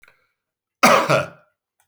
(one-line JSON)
{"cough_length": "1.9 s", "cough_amplitude": 30106, "cough_signal_mean_std_ratio": 0.36, "survey_phase": "beta (2021-08-13 to 2022-03-07)", "age": "45-64", "gender": "Male", "wearing_mask": "No", "symptom_none": true, "smoker_status": "Never smoked", "respiratory_condition_asthma": false, "respiratory_condition_other": false, "recruitment_source": "REACT", "submission_delay": "1 day", "covid_test_result": "Negative", "covid_test_method": "RT-qPCR"}